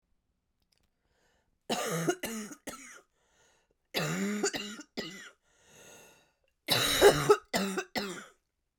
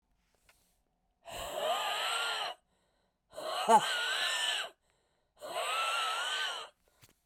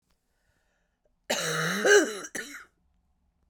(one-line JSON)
{"three_cough_length": "8.8 s", "three_cough_amplitude": 12437, "three_cough_signal_mean_std_ratio": 0.39, "exhalation_length": "7.3 s", "exhalation_amplitude": 7718, "exhalation_signal_mean_std_ratio": 0.57, "cough_length": "3.5 s", "cough_amplitude": 13420, "cough_signal_mean_std_ratio": 0.37, "survey_phase": "beta (2021-08-13 to 2022-03-07)", "age": "45-64", "gender": "Female", "wearing_mask": "No", "symptom_cough_any": true, "symptom_new_continuous_cough": true, "symptom_runny_or_blocked_nose": true, "symptom_shortness_of_breath": true, "symptom_sore_throat": true, "symptom_diarrhoea": true, "symptom_fatigue": true, "symptom_headache": true, "symptom_change_to_sense_of_smell_or_taste": true, "symptom_loss_of_taste": true, "symptom_onset": "7 days", "smoker_status": "Never smoked", "respiratory_condition_asthma": true, "respiratory_condition_other": false, "recruitment_source": "Test and Trace", "submission_delay": "2 days", "covid_test_result": "Positive", "covid_test_method": "RT-qPCR", "covid_ct_value": 33.9, "covid_ct_gene": "ORF1ab gene", "covid_ct_mean": 34.2, "covid_viral_load": "6 copies/ml", "covid_viral_load_category": "Minimal viral load (< 10K copies/ml)"}